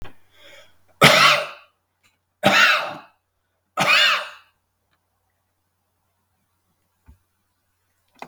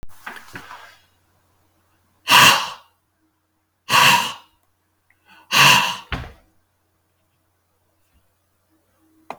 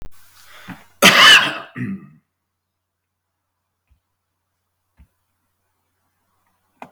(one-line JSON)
{"three_cough_length": "8.3 s", "three_cough_amplitude": 32768, "three_cough_signal_mean_std_ratio": 0.33, "exhalation_length": "9.4 s", "exhalation_amplitude": 32768, "exhalation_signal_mean_std_ratio": 0.3, "cough_length": "6.9 s", "cough_amplitude": 32768, "cough_signal_mean_std_ratio": 0.24, "survey_phase": "beta (2021-08-13 to 2022-03-07)", "age": "65+", "gender": "Male", "wearing_mask": "No", "symptom_none": true, "smoker_status": "Ex-smoker", "respiratory_condition_asthma": false, "respiratory_condition_other": false, "recruitment_source": "REACT", "submission_delay": "6 days", "covid_test_result": "Negative", "covid_test_method": "RT-qPCR"}